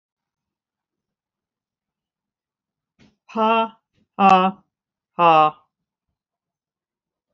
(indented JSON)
{
  "exhalation_length": "7.3 s",
  "exhalation_amplitude": 27005,
  "exhalation_signal_mean_std_ratio": 0.28,
  "survey_phase": "alpha (2021-03-01 to 2021-08-12)",
  "age": "65+",
  "gender": "Female",
  "wearing_mask": "No",
  "symptom_none": true,
  "smoker_status": "Never smoked",
  "respiratory_condition_asthma": false,
  "respiratory_condition_other": false,
  "recruitment_source": "REACT",
  "submission_delay": "2 days",
  "covid_test_result": "Negative",
  "covid_test_method": "RT-qPCR"
}